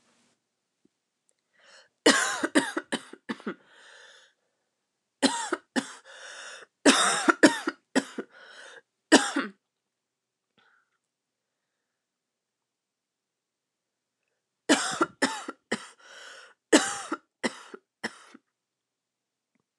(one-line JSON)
{"three_cough_length": "19.8 s", "three_cough_amplitude": 24225, "three_cough_signal_mean_std_ratio": 0.28, "survey_phase": "alpha (2021-03-01 to 2021-08-12)", "age": "18-44", "gender": "Female", "wearing_mask": "No", "symptom_cough_any": true, "symptom_fatigue": true, "symptom_headache": true, "symptom_change_to_sense_of_smell_or_taste": true, "symptom_loss_of_taste": true, "symptom_onset": "4 days", "smoker_status": "Never smoked", "respiratory_condition_asthma": false, "respiratory_condition_other": false, "recruitment_source": "Test and Trace", "submission_delay": "2 days", "covid_test_result": "Positive", "covid_test_method": "RT-qPCR", "covid_ct_value": 25.2, "covid_ct_gene": "N gene"}